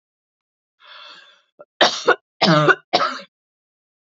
{
  "three_cough_length": "4.0 s",
  "three_cough_amplitude": 30274,
  "three_cough_signal_mean_std_ratio": 0.36,
  "survey_phase": "beta (2021-08-13 to 2022-03-07)",
  "age": "45-64",
  "gender": "Female",
  "wearing_mask": "No",
  "symptom_sore_throat": true,
  "symptom_onset": "12 days",
  "smoker_status": "Ex-smoker",
  "respiratory_condition_asthma": false,
  "respiratory_condition_other": false,
  "recruitment_source": "REACT",
  "submission_delay": "2 days",
  "covid_test_result": "Negative",
  "covid_test_method": "RT-qPCR",
  "influenza_a_test_result": "Negative",
  "influenza_b_test_result": "Negative"
}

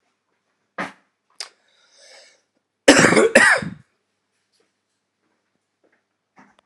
{
  "cough_length": "6.7 s",
  "cough_amplitude": 32768,
  "cough_signal_mean_std_ratio": 0.26,
  "survey_phase": "beta (2021-08-13 to 2022-03-07)",
  "age": "45-64",
  "gender": "Male",
  "wearing_mask": "No",
  "symptom_cough_any": true,
  "symptom_runny_or_blocked_nose": true,
  "symptom_fatigue": true,
  "symptom_onset": "2 days",
  "smoker_status": "Ex-smoker",
  "respiratory_condition_asthma": true,
  "respiratory_condition_other": false,
  "recruitment_source": "Test and Trace",
  "submission_delay": "1 day",
  "covid_test_result": "Positive",
  "covid_test_method": "RT-qPCR",
  "covid_ct_value": 19.0,
  "covid_ct_gene": "ORF1ab gene",
  "covid_ct_mean": 19.2,
  "covid_viral_load": "500000 copies/ml",
  "covid_viral_load_category": "Low viral load (10K-1M copies/ml)"
}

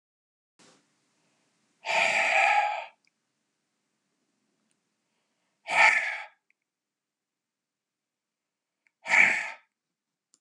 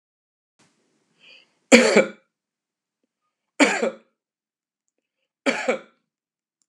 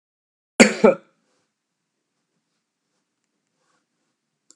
{
  "exhalation_length": "10.4 s",
  "exhalation_amplitude": 15677,
  "exhalation_signal_mean_std_ratio": 0.32,
  "three_cough_length": "6.7 s",
  "three_cough_amplitude": 32768,
  "three_cough_signal_mean_std_ratio": 0.25,
  "cough_length": "4.6 s",
  "cough_amplitude": 32768,
  "cough_signal_mean_std_ratio": 0.16,
  "survey_phase": "beta (2021-08-13 to 2022-03-07)",
  "age": "65+",
  "gender": "Male",
  "wearing_mask": "No",
  "symptom_none": true,
  "smoker_status": "Never smoked",
  "respiratory_condition_asthma": false,
  "respiratory_condition_other": false,
  "recruitment_source": "REACT",
  "submission_delay": "1 day",
  "covid_test_result": "Negative",
  "covid_test_method": "RT-qPCR",
  "influenza_a_test_result": "Negative",
  "influenza_b_test_result": "Negative"
}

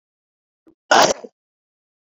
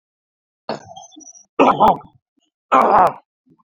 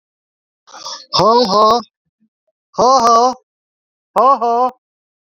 {
  "cough_length": "2.0 s",
  "cough_amplitude": 28710,
  "cough_signal_mean_std_ratio": 0.26,
  "three_cough_length": "3.8 s",
  "three_cough_amplitude": 31139,
  "three_cough_signal_mean_std_ratio": 0.37,
  "exhalation_length": "5.4 s",
  "exhalation_amplitude": 32241,
  "exhalation_signal_mean_std_ratio": 0.5,
  "survey_phase": "beta (2021-08-13 to 2022-03-07)",
  "age": "65+",
  "gender": "Male",
  "wearing_mask": "Yes",
  "symptom_cough_any": true,
  "symptom_onset": "3 days",
  "smoker_status": "Never smoked",
  "respiratory_condition_asthma": false,
  "respiratory_condition_other": false,
  "recruitment_source": "Test and Trace",
  "submission_delay": "2 days",
  "covid_test_result": "Positive",
  "covid_test_method": "RT-qPCR",
  "covid_ct_value": 32.3,
  "covid_ct_gene": "N gene"
}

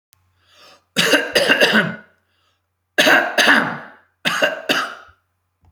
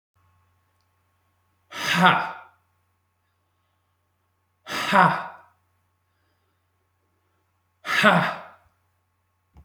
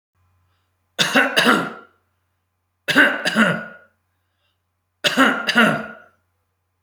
{
  "cough_length": "5.7 s",
  "cough_amplitude": 32767,
  "cough_signal_mean_std_ratio": 0.49,
  "exhalation_length": "9.6 s",
  "exhalation_amplitude": 27961,
  "exhalation_signal_mean_std_ratio": 0.29,
  "three_cough_length": "6.8 s",
  "three_cough_amplitude": 31725,
  "three_cough_signal_mean_std_ratio": 0.43,
  "survey_phase": "alpha (2021-03-01 to 2021-08-12)",
  "age": "45-64",
  "gender": "Male",
  "wearing_mask": "No",
  "symptom_none": true,
  "smoker_status": "Ex-smoker",
  "respiratory_condition_asthma": false,
  "respiratory_condition_other": false,
  "recruitment_source": "REACT",
  "submission_delay": "1 day",
  "covid_test_result": "Negative",
  "covid_test_method": "RT-qPCR"
}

